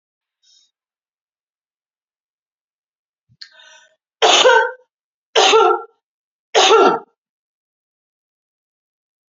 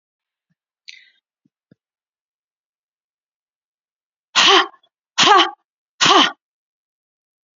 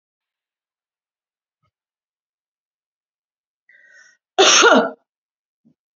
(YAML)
three_cough_length: 9.3 s
three_cough_amplitude: 32767
three_cough_signal_mean_std_ratio: 0.31
exhalation_length: 7.6 s
exhalation_amplitude: 32767
exhalation_signal_mean_std_ratio: 0.27
cough_length: 6.0 s
cough_amplitude: 32585
cough_signal_mean_std_ratio: 0.23
survey_phase: beta (2021-08-13 to 2022-03-07)
age: 45-64
gender: Female
wearing_mask: 'No'
symptom_cough_any: true
symptom_runny_or_blocked_nose: true
symptom_shortness_of_breath: true
symptom_sore_throat: true
symptom_fatigue: true
symptom_onset: 2 days
smoker_status: Never smoked
respiratory_condition_asthma: true
respiratory_condition_other: false
recruitment_source: Test and Trace
submission_delay: 1 day
covid_test_result: Positive
covid_test_method: RT-qPCR
covid_ct_value: 17.5
covid_ct_gene: ORF1ab gene
covid_ct_mean: 18.0
covid_viral_load: 1300000 copies/ml
covid_viral_load_category: High viral load (>1M copies/ml)